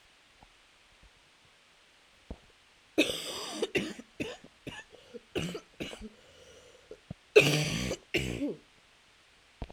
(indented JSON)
{
  "three_cough_length": "9.7 s",
  "three_cough_amplitude": 15756,
  "three_cough_signal_mean_std_ratio": 0.34,
  "survey_phase": "alpha (2021-03-01 to 2021-08-12)",
  "age": "18-44",
  "gender": "Female",
  "wearing_mask": "No",
  "symptom_cough_any": true,
  "symptom_onset": "3 days",
  "smoker_status": "Ex-smoker",
  "respiratory_condition_asthma": false,
  "respiratory_condition_other": false,
  "recruitment_source": "Test and Trace",
  "submission_delay": "2 days",
  "covid_test_result": "Positive",
  "covid_test_method": "RT-qPCR",
  "covid_ct_value": 22.6,
  "covid_ct_gene": "ORF1ab gene",
  "covid_ct_mean": 22.9,
  "covid_viral_load": "31000 copies/ml",
  "covid_viral_load_category": "Low viral load (10K-1M copies/ml)"
}